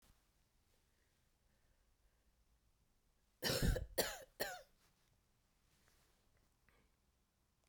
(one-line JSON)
{"cough_length": "7.7 s", "cough_amplitude": 2438, "cough_signal_mean_std_ratio": 0.26, "survey_phase": "beta (2021-08-13 to 2022-03-07)", "age": "45-64", "gender": "Female", "wearing_mask": "No", "symptom_cough_any": true, "symptom_runny_or_blocked_nose": true, "symptom_sore_throat": true, "symptom_fatigue": true, "smoker_status": "Ex-smoker", "respiratory_condition_asthma": false, "respiratory_condition_other": false, "recruitment_source": "Test and Trace", "submission_delay": "2 days", "covid_test_result": "Positive", "covid_test_method": "RT-qPCR", "covid_ct_value": 31.8, "covid_ct_gene": "ORF1ab gene", "covid_ct_mean": 32.2, "covid_viral_load": "28 copies/ml", "covid_viral_load_category": "Minimal viral load (< 10K copies/ml)"}